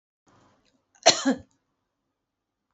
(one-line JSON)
{"three_cough_length": "2.7 s", "three_cough_amplitude": 25229, "three_cough_signal_mean_std_ratio": 0.21, "survey_phase": "beta (2021-08-13 to 2022-03-07)", "age": "45-64", "gender": "Female", "wearing_mask": "No", "symptom_none": true, "smoker_status": "Never smoked", "respiratory_condition_asthma": false, "respiratory_condition_other": false, "recruitment_source": "Test and Trace", "submission_delay": "0 days", "covid_test_result": "Negative", "covid_test_method": "LFT"}